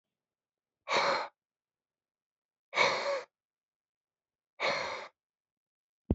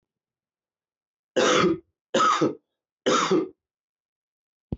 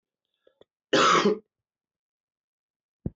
exhalation_length: 6.1 s
exhalation_amplitude: 7360
exhalation_signal_mean_std_ratio: 0.35
three_cough_length: 4.8 s
three_cough_amplitude: 13699
three_cough_signal_mean_std_ratio: 0.43
cough_length: 3.2 s
cough_amplitude: 11751
cough_signal_mean_std_ratio: 0.31
survey_phase: beta (2021-08-13 to 2022-03-07)
age: 45-64
gender: Male
wearing_mask: 'No'
symptom_cough_any: true
symptom_runny_or_blocked_nose: true
symptom_headache: true
symptom_change_to_sense_of_smell_or_taste: true
symptom_loss_of_taste: true
symptom_onset: 4 days
smoker_status: Never smoked
respiratory_condition_asthma: false
respiratory_condition_other: false
recruitment_source: Test and Trace
submission_delay: 2 days
covid_test_result: Positive
covid_test_method: ePCR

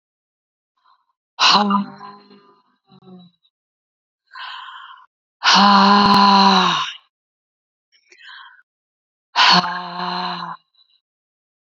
exhalation_length: 11.7 s
exhalation_amplitude: 32702
exhalation_signal_mean_std_ratio: 0.4
survey_phase: beta (2021-08-13 to 2022-03-07)
age: 45-64
gender: Female
wearing_mask: 'No'
symptom_runny_or_blocked_nose: true
smoker_status: Ex-smoker
respiratory_condition_asthma: true
respiratory_condition_other: false
recruitment_source: REACT
submission_delay: 1 day
covid_test_result: Negative
covid_test_method: RT-qPCR
influenza_a_test_result: Unknown/Void
influenza_b_test_result: Unknown/Void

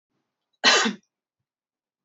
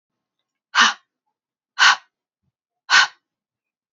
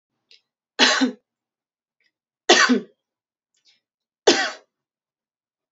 cough_length: 2.0 s
cough_amplitude: 22328
cough_signal_mean_std_ratio: 0.29
exhalation_length: 3.9 s
exhalation_amplitude: 28079
exhalation_signal_mean_std_ratio: 0.28
three_cough_length: 5.7 s
three_cough_amplitude: 29283
three_cough_signal_mean_std_ratio: 0.29
survey_phase: alpha (2021-03-01 to 2021-08-12)
age: 18-44
gender: Female
wearing_mask: 'No'
symptom_fatigue: true
smoker_status: Never smoked
respiratory_condition_asthma: true
respiratory_condition_other: false
recruitment_source: Test and Trace
submission_delay: 2 days
covid_test_result: Positive
covid_test_method: RT-qPCR
covid_ct_value: 20.6
covid_ct_gene: ORF1ab gene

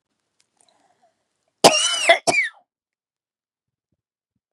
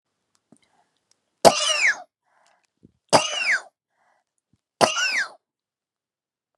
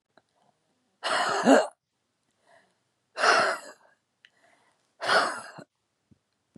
cough_length: 4.5 s
cough_amplitude: 32768
cough_signal_mean_std_ratio: 0.28
three_cough_length: 6.6 s
three_cough_amplitude: 32768
three_cough_signal_mean_std_ratio: 0.31
exhalation_length: 6.6 s
exhalation_amplitude: 16138
exhalation_signal_mean_std_ratio: 0.35
survey_phase: beta (2021-08-13 to 2022-03-07)
age: 45-64
gender: Female
wearing_mask: 'No'
symptom_cough_any: true
symptom_shortness_of_breath: true
symptom_onset: 12 days
smoker_status: Current smoker (e-cigarettes or vapes only)
respiratory_condition_asthma: true
respiratory_condition_other: false
recruitment_source: REACT
submission_delay: 17 days
covid_test_result: Negative
covid_test_method: RT-qPCR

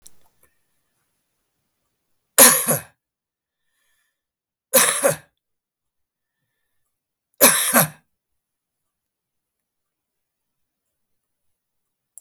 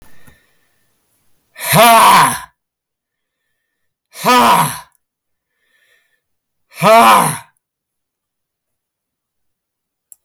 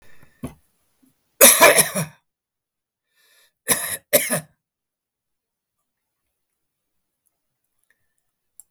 three_cough_length: 12.2 s
three_cough_amplitude: 32768
three_cough_signal_mean_std_ratio: 0.22
exhalation_length: 10.2 s
exhalation_amplitude: 32768
exhalation_signal_mean_std_ratio: 0.37
cough_length: 8.7 s
cough_amplitude: 32768
cough_signal_mean_std_ratio: 0.24
survey_phase: beta (2021-08-13 to 2022-03-07)
age: 65+
gender: Male
wearing_mask: 'No'
symptom_runny_or_blocked_nose: true
smoker_status: Ex-smoker
respiratory_condition_asthma: false
respiratory_condition_other: false
recruitment_source: REACT
submission_delay: 2 days
covid_test_result: Negative
covid_test_method: RT-qPCR
influenza_a_test_result: Negative
influenza_b_test_result: Negative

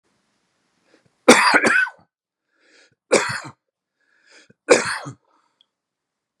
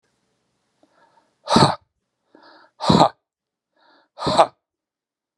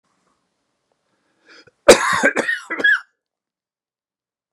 three_cough_length: 6.4 s
three_cough_amplitude: 32768
three_cough_signal_mean_std_ratio: 0.3
exhalation_length: 5.4 s
exhalation_amplitude: 32767
exhalation_signal_mean_std_ratio: 0.27
cough_length: 4.5 s
cough_amplitude: 32768
cough_signal_mean_std_ratio: 0.29
survey_phase: beta (2021-08-13 to 2022-03-07)
age: 65+
gender: Male
wearing_mask: 'No'
symptom_cough_any: true
symptom_runny_or_blocked_nose: true
symptom_sore_throat: true
symptom_onset: 3 days
smoker_status: Never smoked
respiratory_condition_asthma: false
respiratory_condition_other: false
recruitment_source: Test and Trace
submission_delay: 1 day
covid_test_result: Positive
covid_test_method: RT-qPCR
covid_ct_value: 20.1
covid_ct_gene: ORF1ab gene
covid_ct_mean: 20.6
covid_viral_load: 170000 copies/ml
covid_viral_load_category: Low viral load (10K-1M copies/ml)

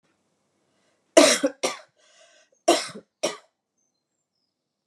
cough_length: 4.9 s
cough_amplitude: 31996
cough_signal_mean_std_ratio: 0.25
survey_phase: alpha (2021-03-01 to 2021-08-12)
age: 45-64
gender: Female
wearing_mask: 'No'
symptom_none: true
symptom_onset: 4 days
smoker_status: Ex-smoker
respiratory_condition_asthma: false
respiratory_condition_other: false
recruitment_source: REACT
submission_delay: 2 days
covid_test_result: Negative
covid_test_method: RT-qPCR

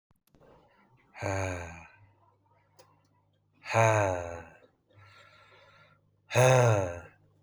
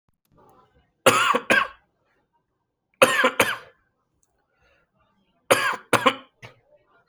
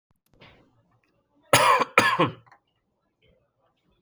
exhalation_length: 7.4 s
exhalation_amplitude: 11012
exhalation_signal_mean_std_ratio: 0.36
three_cough_length: 7.1 s
three_cough_amplitude: 32767
three_cough_signal_mean_std_ratio: 0.33
cough_length: 4.0 s
cough_amplitude: 27400
cough_signal_mean_std_ratio: 0.31
survey_phase: beta (2021-08-13 to 2022-03-07)
age: 18-44
gender: Male
wearing_mask: 'No'
symptom_runny_or_blocked_nose: true
symptom_sore_throat: true
smoker_status: Never smoked
respiratory_condition_asthma: false
respiratory_condition_other: false
recruitment_source: REACT
submission_delay: 1 day
covid_test_result: Negative
covid_test_method: RT-qPCR
influenza_a_test_result: Negative
influenza_b_test_result: Negative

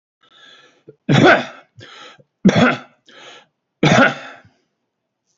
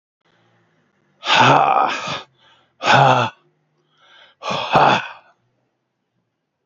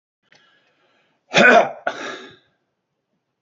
three_cough_length: 5.4 s
three_cough_amplitude: 28316
three_cough_signal_mean_std_ratio: 0.36
exhalation_length: 6.7 s
exhalation_amplitude: 32767
exhalation_signal_mean_std_ratio: 0.42
cough_length: 3.4 s
cough_amplitude: 28009
cough_signal_mean_std_ratio: 0.29
survey_phase: alpha (2021-03-01 to 2021-08-12)
age: 45-64
gender: Male
wearing_mask: 'No'
symptom_cough_any: true
smoker_status: Ex-smoker
respiratory_condition_asthma: false
respiratory_condition_other: false
recruitment_source: Test and Trace
submission_delay: 2 days
covid_test_result: Positive
covid_test_method: RT-qPCR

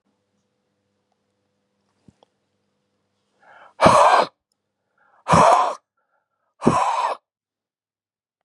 exhalation_length: 8.4 s
exhalation_amplitude: 32276
exhalation_signal_mean_std_ratio: 0.31
survey_phase: beta (2021-08-13 to 2022-03-07)
age: 45-64
gender: Male
wearing_mask: 'No'
symptom_none: true
symptom_onset: 12 days
smoker_status: Ex-smoker
respiratory_condition_asthma: true
respiratory_condition_other: false
recruitment_source: REACT
submission_delay: 4 days
covid_test_result: Negative
covid_test_method: RT-qPCR
influenza_a_test_result: Negative
influenza_b_test_result: Negative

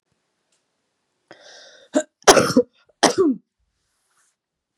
cough_length: 4.8 s
cough_amplitude: 32768
cough_signal_mean_std_ratio: 0.28
survey_phase: beta (2021-08-13 to 2022-03-07)
age: 45-64
gender: Female
wearing_mask: 'No'
symptom_none: true
symptom_onset: 11 days
smoker_status: Never smoked
respiratory_condition_asthma: false
respiratory_condition_other: false
recruitment_source: REACT
submission_delay: 1 day
covid_test_result: Negative
covid_test_method: RT-qPCR
influenza_a_test_result: Negative
influenza_b_test_result: Negative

